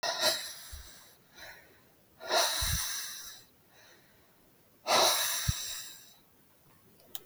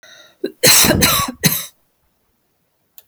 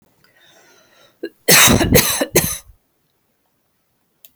{
  "exhalation_length": "7.3 s",
  "exhalation_amplitude": 7581,
  "exhalation_signal_mean_std_ratio": 0.49,
  "cough_length": "3.1 s",
  "cough_amplitude": 32768,
  "cough_signal_mean_std_ratio": 0.43,
  "three_cough_length": "4.4 s",
  "three_cough_amplitude": 32768,
  "three_cough_signal_mean_std_ratio": 0.37,
  "survey_phase": "beta (2021-08-13 to 2022-03-07)",
  "age": "45-64",
  "gender": "Female",
  "wearing_mask": "No",
  "symptom_none": true,
  "smoker_status": "Never smoked",
  "respiratory_condition_asthma": true,
  "respiratory_condition_other": false,
  "recruitment_source": "REACT",
  "submission_delay": "1 day",
  "covid_test_result": "Negative",
  "covid_test_method": "RT-qPCR",
  "influenza_a_test_result": "Negative",
  "influenza_b_test_result": "Negative"
}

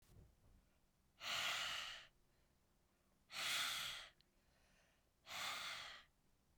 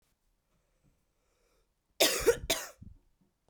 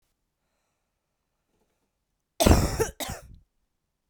{
  "exhalation_length": "6.6 s",
  "exhalation_amplitude": 1041,
  "exhalation_signal_mean_std_ratio": 0.51,
  "three_cough_length": "3.5 s",
  "three_cough_amplitude": 9635,
  "three_cough_signal_mean_std_ratio": 0.28,
  "cough_length": "4.1 s",
  "cough_amplitude": 23458,
  "cough_signal_mean_std_ratio": 0.25,
  "survey_phase": "beta (2021-08-13 to 2022-03-07)",
  "age": "18-44",
  "gender": "Female",
  "wearing_mask": "No",
  "symptom_runny_or_blocked_nose": true,
  "symptom_headache": true,
  "smoker_status": "Current smoker (1 to 10 cigarettes per day)",
  "respiratory_condition_asthma": true,
  "respiratory_condition_other": false,
  "recruitment_source": "Test and Trace",
  "submission_delay": "2 days",
  "covid_test_result": "Positive",
  "covid_test_method": "LAMP"
}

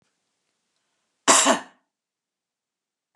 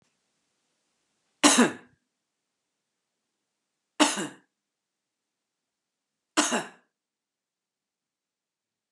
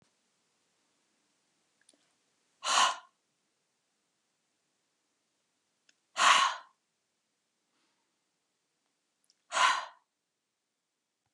{
  "cough_length": "3.2 s",
  "cough_amplitude": 29197,
  "cough_signal_mean_std_ratio": 0.24,
  "three_cough_length": "8.9 s",
  "three_cough_amplitude": 21827,
  "three_cough_signal_mean_std_ratio": 0.21,
  "exhalation_length": "11.3 s",
  "exhalation_amplitude": 10039,
  "exhalation_signal_mean_std_ratio": 0.23,
  "survey_phase": "beta (2021-08-13 to 2022-03-07)",
  "age": "45-64",
  "gender": "Female",
  "wearing_mask": "No",
  "symptom_none": true,
  "symptom_onset": "12 days",
  "smoker_status": "Never smoked",
  "respiratory_condition_asthma": false,
  "respiratory_condition_other": false,
  "recruitment_source": "REACT",
  "submission_delay": "1 day",
  "covid_test_result": "Negative",
  "covid_test_method": "RT-qPCR"
}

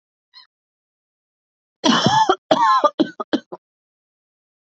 {
  "cough_length": "4.8 s",
  "cough_amplitude": 32639,
  "cough_signal_mean_std_ratio": 0.37,
  "survey_phase": "alpha (2021-03-01 to 2021-08-12)",
  "age": "18-44",
  "gender": "Female",
  "wearing_mask": "No",
  "symptom_cough_any": true,
  "symptom_headache": true,
  "symptom_change_to_sense_of_smell_or_taste": true,
  "symptom_onset": "4 days",
  "smoker_status": "Never smoked",
  "respiratory_condition_asthma": false,
  "respiratory_condition_other": false,
  "recruitment_source": "Test and Trace",
  "submission_delay": "2 days",
  "covid_test_result": "Positive",
  "covid_test_method": "RT-qPCR",
  "covid_ct_value": 13.9,
  "covid_ct_gene": "ORF1ab gene",
  "covid_ct_mean": 14.5,
  "covid_viral_load": "18000000 copies/ml",
  "covid_viral_load_category": "High viral load (>1M copies/ml)"
}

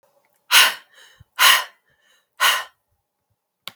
{
  "exhalation_length": "3.8 s",
  "exhalation_amplitude": 32768,
  "exhalation_signal_mean_std_ratio": 0.33,
  "survey_phase": "beta (2021-08-13 to 2022-03-07)",
  "age": "18-44",
  "gender": "Female",
  "wearing_mask": "No",
  "symptom_cough_any": true,
  "symptom_sore_throat": true,
  "symptom_fatigue": true,
  "smoker_status": "Never smoked",
  "respiratory_condition_asthma": false,
  "respiratory_condition_other": false,
  "recruitment_source": "Test and Trace",
  "submission_delay": "2 days",
  "covid_test_result": "Positive",
  "covid_test_method": "ePCR"
}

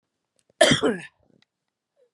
{
  "cough_length": "2.1 s",
  "cough_amplitude": 24131,
  "cough_signal_mean_std_ratio": 0.3,
  "survey_phase": "beta (2021-08-13 to 2022-03-07)",
  "age": "45-64",
  "gender": "Female",
  "wearing_mask": "No",
  "symptom_cough_any": true,
  "symptom_runny_or_blocked_nose": true,
  "symptom_shortness_of_breath": true,
  "symptom_headache": true,
  "symptom_onset": "39 days",
  "smoker_status": "Current smoker (1 to 10 cigarettes per day)",
  "respiratory_condition_asthma": false,
  "respiratory_condition_other": false,
  "recruitment_source": "Test and Trace",
  "submission_delay": "2 days",
  "covid_test_result": "Negative",
  "covid_test_method": "ePCR"
}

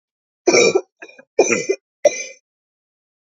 {
  "three_cough_length": "3.3 s",
  "three_cough_amplitude": 29165,
  "three_cough_signal_mean_std_ratio": 0.36,
  "survey_phase": "alpha (2021-03-01 to 2021-08-12)",
  "age": "45-64",
  "gender": "Female",
  "wearing_mask": "No",
  "symptom_cough_any": true,
  "symptom_fatigue": true,
  "symptom_fever_high_temperature": true,
  "symptom_headache": true,
  "symptom_onset": "3 days",
  "smoker_status": "Never smoked",
  "respiratory_condition_asthma": false,
  "respiratory_condition_other": false,
  "recruitment_source": "Test and Trace",
  "submission_delay": "1 day",
  "covid_test_result": "Positive",
  "covid_test_method": "RT-qPCR"
}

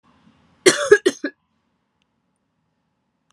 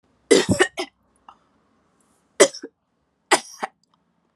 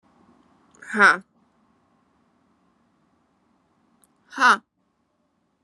{
  "cough_length": "3.3 s",
  "cough_amplitude": 32767,
  "cough_signal_mean_std_ratio": 0.22,
  "three_cough_length": "4.4 s",
  "three_cough_amplitude": 32766,
  "three_cough_signal_mean_std_ratio": 0.26,
  "exhalation_length": "5.6 s",
  "exhalation_amplitude": 27679,
  "exhalation_signal_mean_std_ratio": 0.21,
  "survey_phase": "beta (2021-08-13 to 2022-03-07)",
  "age": "18-44",
  "gender": "Female",
  "wearing_mask": "No",
  "symptom_cough_any": true,
  "symptom_new_continuous_cough": true,
  "symptom_runny_or_blocked_nose": true,
  "symptom_shortness_of_breath": true,
  "symptom_sore_throat": true,
  "symptom_diarrhoea": true,
  "symptom_fatigue": true,
  "symptom_fever_high_temperature": true,
  "symptom_headache": true,
  "symptom_change_to_sense_of_smell_or_taste": true,
  "symptom_loss_of_taste": true,
  "symptom_other": true,
  "symptom_onset": "4 days",
  "smoker_status": "Never smoked",
  "respiratory_condition_asthma": false,
  "respiratory_condition_other": false,
  "recruitment_source": "Test and Trace",
  "submission_delay": "1 day",
  "covid_test_result": "Positive",
  "covid_test_method": "RT-qPCR",
  "covid_ct_value": 24.9,
  "covid_ct_gene": "ORF1ab gene"
}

